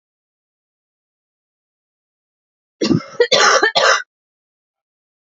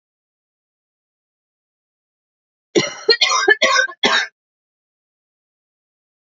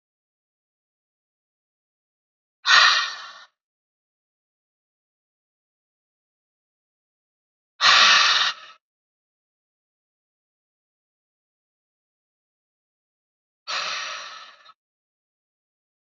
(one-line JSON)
{"three_cough_length": "5.4 s", "three_cough_amplitude": 32768, "three_cough_signal_mean_std_ratio": 0.32, "cough_length": "6.2 s", "cough_amplitude": 30009, "cough_signal_mean_std_ratio": 0.32, "exhalation_length": "16.1 s", "exhalation_amplitude": 29380, "exhalation_signal_mean_std_ratio": 0.23, "survey_phase": "beta (2021-08-13 to 2022-03-07)", "age": "18-44", "gender": "Female", "wearing_mask": "No", "symptom_cough_any": true, "symptom_runny_or_blocked_nose": true, "symptom_fatigue": true, "symptom_headache": true, "symptom_change_to_sense_of_smell_or_taste": true, "symptom_onset": "4 days", "smoker_status": "Never smoked", "respiratory_condition_asthma": true, "respiratory_condition_other": false, "recruitment_source": "Test and Trace", "submission_delay": "2 days", "covid_test_result": "Positive", "covid_test_method": "RT-qPCR", "covid_ct_value": 15.5, "covid_ct_gene": "ORF1ab gene", "covid_ct_mean": 15.8, "covid_viral_load": "6800000 copies/ml", "covid_viral_load_category": "High viral load (>1M copies/ml)"}